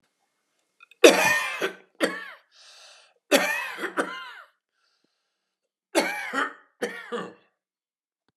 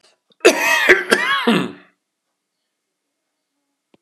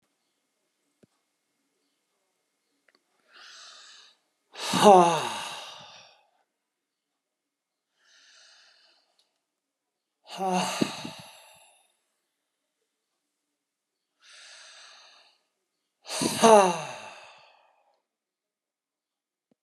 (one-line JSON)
{"three_cough_length": "8.4 s", "three_cough_amplitude": 32497, "three_cough_signal_mean_std_ratio": 0.33, "cough_length": "4.0 s", "cough_amplitude": 32768, "cough_signal_mean_std_ratio": 0.4, "exhalation_length": "19.6 s", "exhalation_amplitude": 28148, "exhalation_signal_mean_std_ratio": 0.21, "survey_phase": "alpha (2021-03-01 to 2021-08-12)", "age": "65+", "gender": "Male", "wearing_mask": "No", "symptom_none": true, "smoker_status": "Ex-smoker", "respiratory_condition_asthma": false, "respiratory_condition_other": false, "recruitment_source": "REACT", "submission_delay": "4 days", "covid_test_result": "Negative", "covid_test_method": "RT-qPCR"}